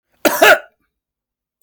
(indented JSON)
{
  "cough_length": "1.6 s",
  "cough_amplitude": 32768,
  "cough_signal_mean_std_ratio": 0.33,
  "survey_phase": "beta (2021-08-13 to 2022-03-07)",
  "age": "45-64",
  "gender": "Male",
  "wearing_mask": "No",
  "symptom_none": true,
  "symptom_onset": "7 days",
  "smoker_status": "Never smoked",
  "respiratory_condition_asthma": false,
  "respiratory_condition_other": false,
  "recruitment_source": "REACT",
  "submission_delay": "2 days",
  "covid_test_result": "Negative",
  "covid_test_method": "RT-qPCR",
  "influenza_a_test_result": "Negative",
  "influenza_b_test_result": "Negative"
}